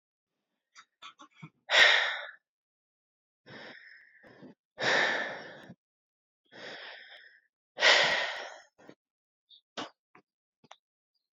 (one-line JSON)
{"exhalation_length": "11.3 s", "exhalation_amplitude": 13076, "exhalation_signal_mean_std_ratio": 0.31, "survey_phase": "alpha (2021-03-01 to 2021-08-12)", "age": "18-44", "gender": "Female", "wearing_mask": "No", "symptom_cough_any": true, "symptom_shortness_of_breath": true, "symptom_fatigue": true, "symptom_fever_high_temperature": true, "symptom_change_to_sense_of_smell_or_taste": true, "symptom_onset": "4 days", "smoker_status": "Ex-smoker", "respiratory_condition_asthma": true, "respiratory_condition_other": false, "recruitment_source": "Test and Trace", "submission_delay": "2 days", "covid_test_result": "Positive", "covid_test_method": "RT-qPCR", "covid_ct_value": 35.6, "covid_ct_gene": "N gene", "covid_ct_mean": 35.6, "covid_viral_load": "2.1 copies/ml", "covid_viral_load_category": "Minimal viral load (< 10K copies/ml)"}